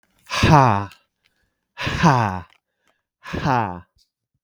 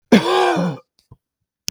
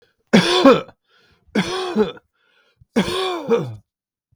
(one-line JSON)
{"exhalation_length": "4.4 s", "exhalation_amplitude": 32768, "exhalation_signal_mean_std_ratio": 0.43, "cough_length": "1.7 s", "cough_amplitude": 32768, "cough_signal_mean_std_ratio": 0.48, "three_cough_length": "4.4 s", "three_cough_amplitude": 32768, "three_cough_signal_mean_std_ratio": 0.45, "survey_phase": "beta (2021-08-13 to 2022-03-07)", "age": "45-64", "gender": "Male", "wearing_mask": "No", "symptom_runny_or_blocked_nose": true, "symptom_fatigue": true, "symptom_headache": true, "symptom_onset": "5 days", "smoker_status": "Never smoked", "respiratory_condition_asthma": true, "respiratory_condition_other": false, "recruitment_source": "Test and Trace", "submission_delay": "2 days", "covid_test_result": "Positive", "covid_test_method": "RT-qPCR", "covid_ct_value": 16.7, "covid_ct_gene": "ORF1ab gene", "covid_ct_mean": 17.3, "covid_viral_load": "2200000 copies/ml", "covid_viral_load_category": "High viral load (>1M copies/ml)"}